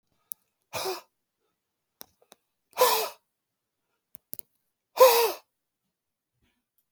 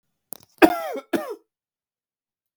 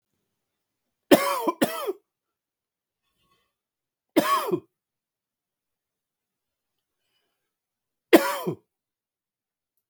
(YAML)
exhalation_length: 6.9 s
exhalation_amplitude: 19007
exhalation_signal_mean_std_ratio: 0.24
cough_length: 2.6 s
cough_amplitude: 32768
cough_signal_mean_std_ratio: 0.25
three_cough_length: 9.9 s
three_cough_amplitude: 32766
three_cough_signal_mean_std_ratio: 0.23
survey_phase: beta (2021-08-13 to 2022-03-07)
age: 45-64
gender: Male
wearing_mask: 'No'
symptom_cough_any: true
symptom_runny_or_blocked_nose: true
symptom_fatigue: true
symptom_headache: true
smoker_status: Never smoked
respiratory_condition_asthma: false
respiratory_condition_other: false
recruitment_source: Test and Trace
submission_delay: -1 day
covid_test_result: Positive
covid_test_method: LFT